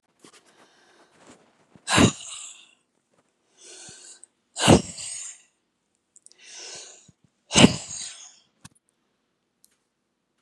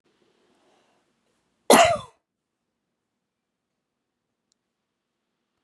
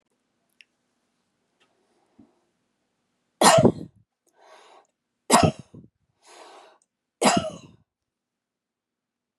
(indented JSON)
{
  "exhalation_length": "10.4 s",
  "exhalation_amplitude": 32768,
  "exhalation_signal_mean_std_ratio": 0.23,
  "cough_length": "5.6 s",
  "cough_amplitude": 28845,
  "cough_signal_mean_std_ratio": 0.17,
  "three_cough_length": "9.4 s",
  "three_cough_amplitude": 28475,
  "three_cough_signal_mean_std_ratio": 0.23,
  "survey_phase": "beta (2021-08-13 to 2022-03-07)",
  "age": "65+",
  "gender": "Female",
  "wearing_mask": "No",
  "symptom_none": true,
  "smoker_status": "Ex-smoker",
  "respiratory_condition_asthma": false,
  "respiratory_condition_other": false,
  "recruitment_source": "REACT",
  "submission_delay": "2 days",
  "covid_test_result": "Negative",
  "covid_test_method": "RT-qPCR",
  "influenza_a_test_result": "Negative",
  "influenza_b_test_result": "Negative"
}